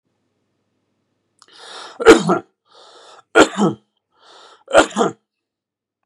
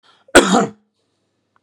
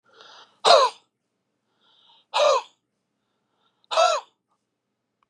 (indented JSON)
{
  "three_cough_length": "6.1 s",
  "three_cough_amplitude": 32768,
  "three_cough_signal_mean_std_ratio": 0.28,
  "cough_length": "1.6 s",
  "cough_amplitude": 32768,
  "cough_signal_mean_std_ratio": 0.32,
  "exhalation_length": "5.3 s",
  "exhalation_amplitude": 27217,
  "exhalation_signal_mean_std_ratio": 0.31,
  "survey_phase": "beta (2021-08-13 to 2022-03-07)",
  "age": "45-64",
  "gender": "Male",
  "wearing_mask": "No",
  "symptom_none": true,
  "symptom_onset": "8 days",
  "smoker_status": "Never smoked",
  "respiratory_condition_asthma": false,
  "respiratory_condition_other": false,
  "recruitment_source": "REACT",
  "submission_delay": "1 day",
  "covid_test_result": "Negative",
  "covid_test_method": "RT-qPCR",
  "influenza_a_test_result": "Negative",
  "influenza_b_test_result": "Negative"
}